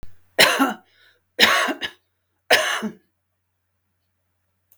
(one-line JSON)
{"three_cough_length": "4.8 s", "three_cough_amplitude": 32768, "three_cough_signal_mean_std_ratio": 0.37, "survey_phase": "beta (2021-08-13 to 2022-03-07)", "age": "65+", "gender": "Female", "wearing_mask": "No", "symptom_none": true, "symptom_onset": "12 days", "smoker_status": "Never smoked", "respiratory_condition_asthma": false, "respiratory_condition_other": false, "recruitment_source": "REACT", "submission_delay": "2 days", "covid_test_result": "Negative", "covid_test_method": "RT-qPCR"}